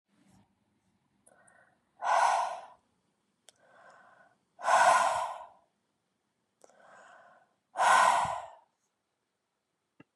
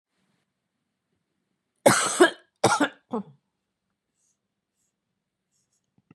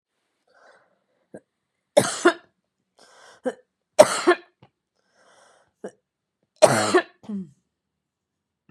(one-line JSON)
{"exhalation_length": "10.2 s", "exhalation_amplitude": 9355, "exhalation_signal_mean_std_ratio": 0.35, "cough_length": "6.1 s", "cough_amplitude": 23844, "cough_signal_mean_std_ratio": 0.24, "three_cough_length": "8.7 s", "three_cough_amplitude": 32768, "three_cough_signal_mean_std_ratio": 0.24, "survey_phase": "beta (2021-08-13 to 2022-03-07)", "age": "45-64", "gender": "Female", "wearing_mask": "No", "symptom_none": true, "smoker_status": "Ex-smoker", "respiratory_condition_asthma": false, "respiratory_condition_other": false, "recruitment_source": "REACT", "submission_delay": "1 day", "covid_test_result": "Negative", "covid_test_method": "RT-qPCR", "influenza_a_test_result": "Negative", "influenza_b_test_result": "Negative"}